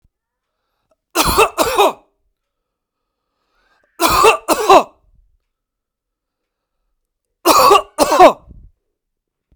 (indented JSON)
{
  "cough_length": "9.6 s",
  "cough_amplitude": 32768,
  "cough_signal_mean_std_ratio": 0.35,
  "survey_phase": "beta (2021-08-13 to 2022-03-07)",
  "age": "18-44",
  "gender": "Male",
  "wearing_mask": "No",
  "symptom_none": true,
  "smoker_status": "Never smoked",
  "respiratory_condition_asthma": false,
  "respiratory_condition_other": false,
  "recruitment_source": "REACT",
  "submission_delay": "1 day",
  "covid_test_result": "Negative",
  "covid_test_method": "RT-qPCR"
}